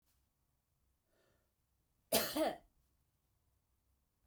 {"cough_length": "4.3 s", "cough_amplitude": 4287, "cough_signal_mean_std_ratio": 0.25, "survey_phase": "beta (2021-08-13 to 2022-03-07)", "age": "45-64", "gender": "Female", "wearing_mask": "No", "symptom_runny_or_blocked_nose": true, "smoker_status": "Never smoked", "respiratory_condition_asthma": false, "respiratory_condition_other": true, "recruitment_source": "REACT", "submission_delay": "1 day", "covid_test_result": "Negative", "covid_test_method": "RT-qPCR"}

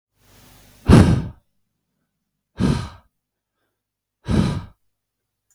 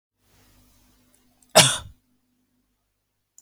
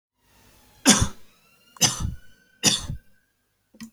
{"exhalation_length": "5.5 s", "exhalation_amplitude": 32768, "exhalation_signal_mean_std_ratio": 0.29, "cough_length": "3.4 s", "cough_amplitude": 32768, "cough_signal_mean_std_ratio": 0.18, "three_cough_length": "3.9 s", "three_cough_amplitude": 28953, "three_cough_signal_mean_std_ratio": 0.33, "survey_phase": "beta (2021-08-13 to 2022-03-07)", "age": "18-44", "gender": "Male", "wearing_mask": "No", "symptom_other": true, "smoker_status": "Ex-smoker", "respiratory_condition_asthma": true, "respiratory_condition_other": false, "recruitment_source": "REACT", "submission_delay": "1 day", "covid_test_result": "Negative", "covid_test_method": "RT-qPCR"}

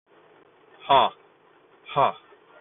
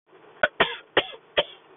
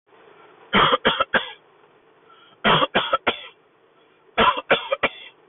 {"exhalation_length": "2.6 s", "exhalation_amplitude": 18262, "exhalation_signal_mean_std_ratio": 0.3, "cough_length": "1.8 s", "cough_amplitude": 18142, "cough_signal_mean_std_ratio": 0.32, "three_cough_length": "5.5 s", "three_cough_amplitude": 20695, "three_cough_signal_mean_std_ratio": 0.43, "survey_phase": "beta (2021-08-13 to 2022-03-07)", "age": "45-64", "gender": "Male", "wearing_mask": "No", "symptom_none": true, "smoker_status": "Never smoked", "respiratory_condition_asthma": false, "respiratory_condition_other": false, "recruitment_source": "REACT", "submission_delay": "0 days", "covid_test_result": "Negative", "covid_test_method": "RT-qPCR", "influenza_a_test_result": "Negative", "influenza_b_test_result": "Negative"}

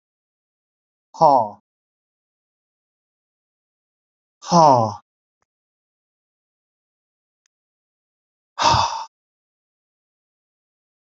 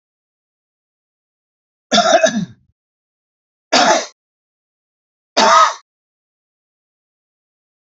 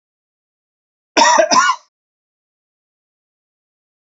{"exhalation_length": "11.1 s", "exhalation_amplitude": 28444, "exhalation_signal_mean_std_ratio": 0.23, "three_cough_length": "7.9 s", "three_cough_amplitude": 32239, "three_cough_signal_mean_std_ratio": 0.31, "cough_length": "4.2 s", "cough_amplitude": 30020, "cough_signal_mean_std_ratio": 0.3, "survey_phase": "beta (2021-08-13 to 2022-03-07)", "age": "65+", "gender": "Male", "wearing_mask": "No", "symptom_cough_any": true, "symptom_runny_or_blocked_nose": true, "symptom_sore_throat": true, "symptom_onset": "4 days", "smoker_status": "Never smoked", "respiratory_condition_asthma": false, "respiratory_condition_other": false, "recruitment_source": "Test and Trace", "submission_delay": "1 day", "covid_test_result": "Positive", "covid_test_method": "RT-qPCR", "covid_ct_value": 20.4, "covid_ct_gene": "N gene"}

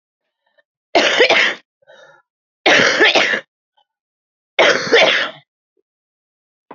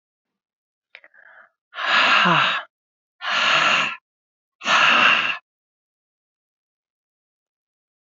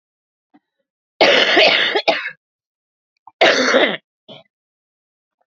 {"three_cough_length": "6.7 s", "three_cough_amplitude": 30339, "three_cough_signal_mean_std_ratio": 0.44, "exhalation_length": "8.0 s", "exhalation_amplitude": 22163, "exhalation_signal_mean_std_ratio": 0.44, "cough_length": "5.5 s", "cough_amplitude": 31807, "cough_signal_mean_std_ratio": 0.42, "survey_phase": "beta (2021-08-13 to 2022-03-07)", "age": "45-64", "gender": "Female", "wearing_mask": "No", "symptom_cough_any": true, "symptom_runny_or_blocked_nose": true, "symptom_shortness_of_breath": true, "symptom_sore_throat": true, "symptom_fatigue": true, "symptom_headache": true, "symptom_change_to_sense_of_smell_or_taste": true, "symptom_other": true, "smoker_status": "Current smoker (11 or more cigarettes per day)", "respiratory_condition_asthma": true, "respiratory_condition_other": true, "recruitment_source": "Test and Trace", "submission_delay": "2 days", "covid_test_result": "Positive", "covid_test_method": "RT-qPCR", "covid_ct_value": 29.7, "covid_ct_gene": "N gene"}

